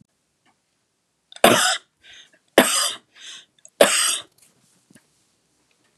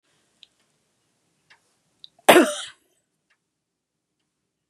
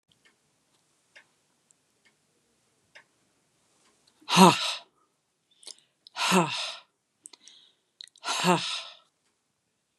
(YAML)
three_cough_length: 6.0 s
three_cough_amplitude: 32768
three_cough_signal_mean_std_ratio: 0.31
cough_length: 4.7 s
cough_amplitude: 32767
cough_signal_mean_std_ratio: 0.17
exhalation_length: 10.0 s
exhalation_amplitude: 26593
exhalation_signal_mean_std_ratio: 0.25
survey_phase: beta (2021-08-13 to 2022-03-07)
age: 45-64
gender: Female
wearing_mask: 'No'
symptom_none: true
smoker_status: Ex-smoker
respiratory_condition_asthma: false
respiratory_condition_other: false
recruitment_source: REACT
submission_delay: 2 days
covid_test_result: Negative
covid_test_method: RT-qPCR
influenza_a_test_result: Negative
influenza_b_test_result: Negative